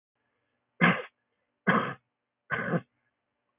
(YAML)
three_cough_length: 3.6 s
three_cough_amplitude: 11147
three_cough_signal_mean_std_ratio: 0.33
survey_phase: beta (2021-08-13 to 2022-03-07)
age: 65+
gender: Male
wearing_mask: 'No'
symptom_none: true
smoker_status: Never smoked
respiratory_condition_asthma: false
respiratory_condition_other: false
recruitment_source: REACT
submission_delay: 1 day
covid_test_result: Negative
covid_test_method: RT-qPCR
influenza_a_test_result: Negative
influenza_b_test_result: Negative